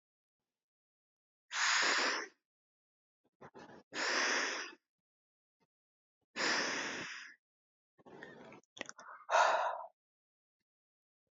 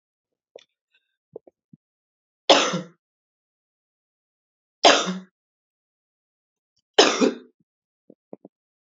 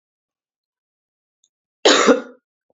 {
  "exhalation_length": "11.3 s",
  "exhalation_amplitude": 4952,
  "exhalation_signal_mean_std_ratio": 0.41,
  "three_cough_length": "8.9 s",
  "three_cough_amplitude": 31199,
  "three_cough_signal_mean_std_ratio": 0.23,
  "cough_length": "2.7 s",
  "cough_amplitude": 28331,
  "cough_signal_mean_std_ratio": 0.28,
  "survey_phase": "beta (2021-08-13 to 2022-03-07)",
  "age": "18-44",
  "gender": "Female",
  "wearing_mask": "Yes",
  "symptom_cough_any": true,
  "symptom_runny_or_blocked_nose": true,
  "symptom_abdominal_pain": true,
  "symptom_fatigue": true,
  "smoker_status": "Never smoked",
  "respiratory_condition_asthma": false,
  "respiratory_condition_other": false,
  "recruitment_source": "Test and Trace",
  "submission_delay": "2 days",
  "covid_test_result": "Positive",
  "covid_test_method": "RT-qPCR",
  "covid_ct_value": 26.7,
  "covid_ct_gene": "ORF1ab gene",
  "covid_ct_mean": 27.5,
  "covid_viral_load": "990 copies/ml",
  "covid_viral_load_category": "Minimal viral load (< 10K copies/ml)"
}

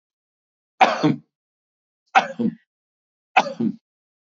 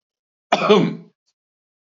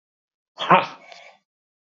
{
  "three_cough_length": "4.4 s",
  "three_cough_amplitude": 32767,
  "three_cough_signal_mean_std_ratio": 0.31,
  "cough_length": "2.0 s",
  "cough_amplitude": 30981,
  "cough_signal_mean_std_ratio": 0.35,
  "exhalation_length": "2.0 s",
  "exhalation_amplitude": 27489,
  "exhalation_signal_mean_std_ratio": 0.25,
  "survey_phase": "beta (2021-08-13 to 2022-03-07)",
  "age": "45-64",
  "gender": "Male",
  "wearing_mask": "No",
  "symptom_none": true,
  "smoker_status": "Never smoked",
  "respiratory_condition_asthma": false,
  "respiratory_condition_other": false,
  "recruitment_source": "REACT",
  "submission_delay": "4 days",
  "covid_test_result": "Negative",
  "covid_test_method": "RT-qPCR",
  "influenza_a_test_result": "Negative",
  "influenza_b_test_result": "Negative"
}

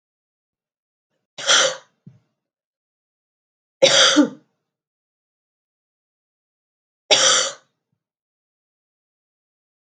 {
  "three_cough_length": "10.0 s",
  "three_cough_amplitude": 31459,
  "three_cough_signal_mean_std_ratio": 0.26,
  "survey_phase": "beta (2021-08-13 to 2022-03-07)",
  "age": "18-44",
  "gender": "Female",
  "wearing_mask": "No",
  "symptom_cough_any": true,
  "symptom_runny_or_blocked_nose": true,
  "symptom_loss_of_taste": true,
  "symptom_onset": "3 days",
  "smoker_status": "Never smoked",
  "respiratory_condition_asthma": false,
  "respiratory_condition_other": false,
  "recruitment_source": "Test and Trace",
  "submission_delay": "2 days",
  "covid_test_result": "Positive",
  "covid_test_method": "RT-qPCR",
  "covid_ct_value": 15.7,
  "covid_ct_gene": "ORF1ab gene",
  "covid_ct_mean": 16.0,
  "covid_viral_load": "5600000 copies/ml",
  "covid_viral_load_category": "High viral load (>1M copies/ml)"
}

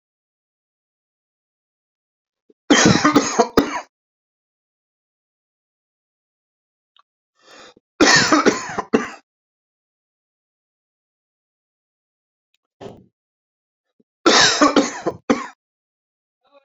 {
  "three_cough_length": "16.6 s",
  "three_cough_amplitude": 32768,
  "three_cough_signal_mean_std_ratio": 0.29,
  "survey_phase": "beta (2021-08-13 to 2022-03-07)",
  "age": "45-64",
  "gender": "Male",
  "wearing_mask": "No",
  "symptom_shortness_of_breath": true,
  "symptom_fatigue": true,
  "smoker_status": "Ex-smoker",
  "respiratory_condition_asthma": false,
  "respiratory_condition_other": false,
  "recruitment_source": "REACT",
  "submission_delay": "3 days",
  "covid_test_result": "Negative",
  "covid_test_method": "RT-qPCR"
}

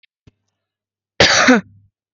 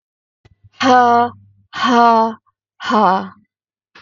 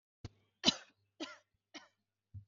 {
  "cough_length": "2.1 s",
  "cough_amplitude": 32768,
  "cough_signal_mean_std_ratio": 0.36,
  "exhalation_length": "4.0 s",
  "exhalation_amplitude": 32766,
  "exhalation_signal_mean_std_ratio": 0.51,
  "three_cough_length": "2.5 s",
  "three_cough_amplitude": 7745,
  "three_cough_signal_mean_std_ratio": 0.2,
  "survey_phase": "beta (2021-08-13 to 2022-03-07)",
  "age": "18-44",
  "gender": "Female",
  "wearing_mask": "No",
  "symptom_none": true,
  "smoker_status": "Ex-smoker",
  "respiratory_condition_asthma": false,
  "respiratory_condition_other": false,
  "recruitment_source": "REACT",
  "submission_delay": "13 days",
  "covid_test_result": "Negative",
  "covid_test_method": "RT-qPCR",
  "influenza_a_test_result": "Negative",
  "influenza_b_test_result": "Negative"
}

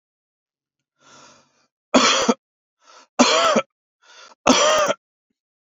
{
  "three_cough_length": "5.7 s",
  "three_cough_amplitude": 29379,
  "three_cough_signal_mean_std_ratio": 0.39,
  "survey_phase": "beta (2021-08-13 to 2022-03-07)",
  "age": "45-64",
  "gender": "Male",
  "wearing_mask": "No",
  "symptom_none": true,
  "smoker_status": "Ex-smoker",
  "respiratory_condition_asthma": false,
  "respiratory_condition_other": false,
  "recruitment_source": "REACT",
  "submission_delay": "0 days",
  "covid_test_result": "Negative",
  "covid_test_method": "RT-qPCR"
}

